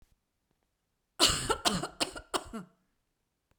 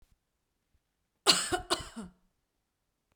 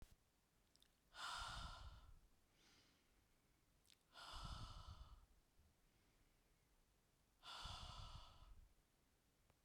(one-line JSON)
{"three_cough_length": "3.6 s", "three_cough_amplitude": 11169, "three_cough_signal_mean_std_ratio": 0.34, "cough_length": "3.2 s", "cough_amplitude": 14785, "cough_signal_mean_std_ratio": 0.26, "exhalation_length": "9.6 s", "exhalation_amplitude": 378, "exhalation_signal_mean_std_ratio": 0.55, "survey_phase": "beta (2021-08-13 to 2022-03-07)", "age": "45-64", "gender": "Female", "wearing_mask": "No", "symptom_none": true, "smoker_status": "Ex-smoker", "respiratory_condition_asthma": false, "respiratory_condition_other": false, "recruitment_source": "REACT", "submission_delay": "3 days", "covid_test_result": "Negative", "covid_test_method": "RT-qPCR", "influenza_a_test_result": "Negative", "influenza_b_test_result": "Negative"}